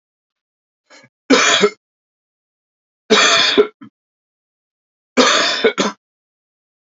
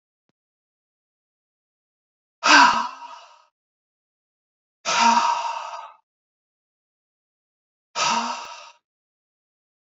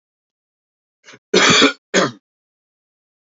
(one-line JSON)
{"three_cough_length": "7.0 s", "three_cough_amplitude": 32672, "three_cough_signal_mean_std_ratio": 0.39, "exhalation_length": "9.9 s", "exhalation_amplitude": 28485, "exhalation_signal_mean_std_ratio": 0.3, "cough_length": "3.2 s", "cough_amplitude": 32167, "cough_signal_mean_std_ratio": 0.33, "survey_phase": "beta (2021-08-13 to 2022-03-07)", "age": "45-64", "gender": "Male", "wearing_mask": "No", "symptom_cough_any": true, "symptom_runny_or_blocked_nose": true, "symptom_fatigue": true, "smoker_status": "Ex-smoker", "respiratory_condition_asthma": false, "respiratory_condition_other": false, "recruitment_source": "Test and Trace", "submission_delay": "2 days", "covid_test_result": "Positive", "covid_test_method": "ePCR"}